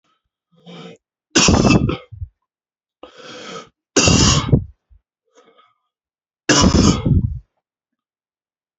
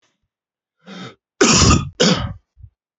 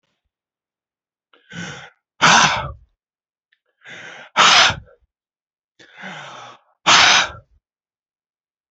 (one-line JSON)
{"three_cough_length": "8.8 s", "three_cough_amplitude": 32495, "three_cough_signal_mean_std_ratio": 0.4, "cough_length": "3.0 s", "cough_amplitude": 30148, "cough_signal_mean_std_ratio": 0.42, "exhalation_length": "8.7 s", "exhalation_amplitude": 32188, "exhalation_signal_mean_std_ratio": 0.33, "survey_phase": "beta (2021-08-13 to 2022-03-07)", "age": "45-64", "gender": "Male", "wearing_mask": "No", "symptom_cough_any": true, "symptom_sore_throat": true, "smoker_status": "Ex-smoker", "respiratory_condition_asthma": false, "respiratory_condition_other": false, "recruitment_source": "Test and Trace", "submission_delay": "2 days", "covid_test_result": "Positive", "covid_test_method": "RT-qPCR", "covid_ct_value": 15.0, "covid_ct_gene": "N gene", "covid_ct_mean": 15.2, "covid_viral_load": "10000000 copies/ml", "covid_viral_load_category": "High viral load (>1M copies/ml)"}